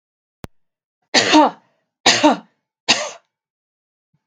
{"three_cough_length": "4.3 s", "three_cough_amplitude": 32768, "three_cough_signal_mean_std_ratio": 0.33, "survey_phase": "beta (2021-08-13 to 2022-03-07)", "age": "45-64", "gender": "Female", "wearing_mask": "No", "symptom_none": true, "smoker_status": "Never smoked", "respiratory_condition_asthma": false, "respiratory_condition_other": false, "recruitment_source": "REACT", "submission_delay": "2 days", "covid_test_result": "Negative", "covid_test_method": "RT-qPCR", "influenza_a_test_result": "Negative", "influenza_b_test_result": "Negative"}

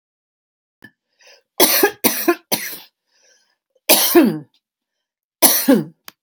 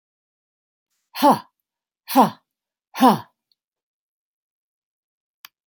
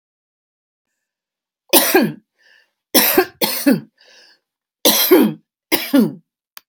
{"cough_length": "6.2 s", "cough_amplitude": 32768, "cough_signal_mean_std_ratio": 0.39, "exhalation_length": "5.7 s", "exhalation_amplitude": 28697, "exhalation_signal_mean_std_ratio": 0.23, "three_cough_length": "6.7 s", "three_cough_amplitude": 32768, "three_cough_signal_mean_std_ratio": 0.41, "survey_phase": "beta (2021-08-13 to 2022-03-07)", "age": "65+", "gender": "Female", "wearing_mask": "No", "symptom_runny_or_blocked_nose": true, "smoker_status": "Ex-smoker", "respiratory_condition_asthma": false, "respiratory_condition_other": false, "recruitment_source": "REACT", "submission_delay": "1 day", "covid_test_result": "Negative", "covid_test_method": "RT-qPCR", "influenza_a_test_result": "Negative", "influenza_b_test_result": "Negative"}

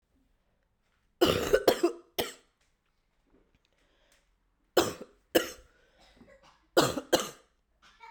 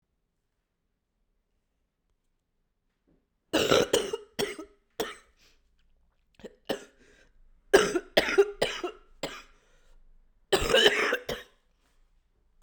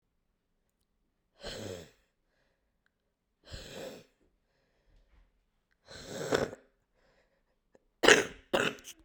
{"three_cough_length": "8.1 s", "three_cough_amplitude": 12698, "three_cough_signal_mean_std_ratio": 0.29, "cough_length": "12.6 s", "cough_amplitude": 18418, "cough_signal_mean_std_ratio": 0.32, "exhalation_length": "9.0 s", "exhalation_amplitude": 26975, "exhalation_signal_mean_std_ratio": 0.22, "survey_phase": "beta (2021-08-13 to 2022-03-07)", "age": "18-44", "gender": "Female", "wearing_mask": "No", "symptom_cough_any": true, "symptom_new_continuous_cough": true, "symptom_shortness_of_breath": true, "symptom_sore_throat": true, "symptom_abdominal_pain": true, "symptom_diarrhoea": true, "symptom_fatigue": true, "symptom_fever_high_temperature": true, "symptom_headache": true, "symptom_change_to_sense_of_smell_or_taste": true, "smoker_status": "Never smoked", "respiratory_condition_asthma": false, "respiratory_condition_other": false, "recruitment_source": "Test and Trace", "submission_delay": "3 days", "covid_test_result": "Positive", "covid_test_method": "RT-qPCR", "covid_ct_value": 31.3, "covid_ct_gene": "ORF1ab gene"}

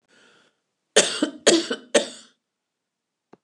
{"cough_length": "3.4 s", "cough_amplitude": 28216, "cough_signal_mean_std_ratio": 0.31, "survey_phase": "beta (2021-08-13 to 2022-03-07)", "age": "65+", "gender": "Female", "wearing_mask": "No", "symptom_none": true, "smoker_status": "Ex-smoker", "respiratory_condition_asthma": false, "respiratory_condition_other": false, "recruitment_source": "REACT", "submission_delay": "3 days", "covid_test_result": "Negative", "covid_test_method": "RT-qPCR"}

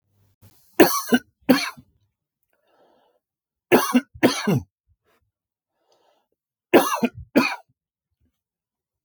{"three_cough_length": "9.0 s", "three_cough_amplitude": 32768, "three_cough_signal_mean_std_ratio": 0.3, "survey_phase": "beta (2021-08-13 to 2022-03-07)", "age": "45-64", "gender": "Male", "wearing_mask": "No", "symptom_none": true, "smoker_status": "Ex-smoker", "respiratory_condition_asthma": false, "respiratory_condition_other": false, "recruitment_source": "REACT", "submission_delay": "2 days", "covid_test_result": "Negative", "covid_test_method": "RT-qPCR", "influenza_a_test_result": "Negative", "influenza_b_test_result": "Negative"}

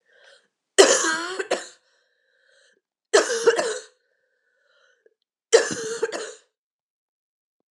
{"three_cough_length": "7.7 s", "three_cough_amplitude": 32768, "three_cough_signal_mean_std_ratio": 0.33, "survey_phase": "beta (2021-08-13 to 2022-03-07)", "age": "18-44", "gender": "Female", "wearing_mask": "No", "symptom_cough_any": true, "symptom_new_continuous_cough": true, "symptom_runny_or_blocked_nose": true, "symptom_sore_throat": true, "symptom_abdominal_pain": true, "symptom_fatigue": true, "symptom_headache": true, "symptom_change_to_sense_of_smell_or_taste": true, "symptom_onset": "4 days", "smoker_status": "Never smoked", "respiratory_condition_asthma": false, "respiratory_condition_other": false, "recruitment_source": "Test and Trace", "submission_delay": "2 days", "covid_test_result": "Positive", "covid_test_method": "RT-qPCR", "covid_ct_value": 21.6, "covid_ct_gene": "N gene", "covid_ct_mean": 21.9, "covid_viral_load": "64000 copies/ml", "covid_viral_load_category": "Low viral load (10K-1M copies/ml)"}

